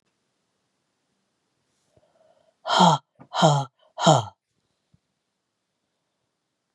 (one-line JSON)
{"exhalation_length": "6.7 s", "exhalation_amplitude": 28135, "exhalation_signal_mean_std_ratio": 0.27, "survey_phase": "beta (2021-08-13 to 2022-03-07)", "age": "45-64", "gender": "Female", "wearing_mask": "No", "symptom_cough_any": true, "symptom_runny_or_blocked_nose": true, "symptom_shortness_of_breath": true, "symptom_sore_throat": true, "symptom_fatigue": true, "symptom_fever_high_temperature": true, "symptom_headache": true, "smoker_status": "Never smoked", "respiratory_condition_asthma": false, "respiratory_condition_other": false, "recruitment_source": "Test and Trace", "submission_delay": "1 day", "covid_test_result": "Positive", "covid_test_method": "ePCR"}